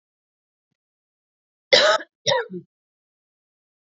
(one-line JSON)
{"cough_length": "3.8 s", "cough_amplitude": 28123, "cough_signal_mean_std_ratio": 0.27, "survey_phase": "beta (2021-08-13 to 2022-03-07)", "age": "45-64", "gender": "Female", "wearing_mask": "No", "symptom_cough_any": true, "symptom_sore_throat": true, "symptom_headache": true, "symptom_change_to_sense_of_smell_or_taste": true, "smoker_status": "Ex-smoker", "respiratory_condition_asthma": false, "respiratory_condition_other": false, "recruitment_source": "Test and Trace", "submission_delay": "1 day", "covid_test_result": "Positive", "covid_test_method": "RT-qPCR", "covid_ct_value": 33.4, "covid_ct_gene": "ORF1ab gene", "covid_ct_mean": 34.1, "covid_viral_load": "6.6 copies/ml", "covid_viral_load_category": "Minimal viral load (< 10K copies/ml)"}